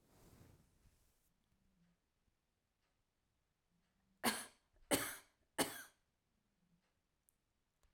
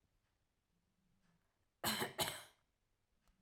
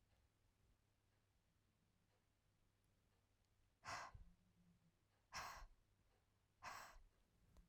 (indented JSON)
{
  "three_cough_length": "7.9 s",
  "three_cough_amplitude": 2846,
  "three_cough_signal_mean_std_ratio": 0.22,
  "cough_length": "3.4 s",
  "cough_amplitude": 1934,
  "cough_signal_mean_std_ratio": 0.3,
  "exhalation_length": "7.7 s",
  "exhalation_amplitude": 300,
  "exhalation_signal_mean_std_ratio": 0.4,
  "survey_phase": "alpha (2021-03-01 to 2021-08-12)",
  "age": "18-44",
  "gender": "Female",
  "wearing_mask": "No",
  "symptom_none": true,
  "smoker_status": "Never smoked",
  "respiratory_condition_asthma": false,
  "respiratory_condition_other": false,
  "recruitment_source": "REACT",
  "submission_delay": "1 day",
  "covid_test_result": "Negative",
  "covid_test_method": "RT-qPCR"
}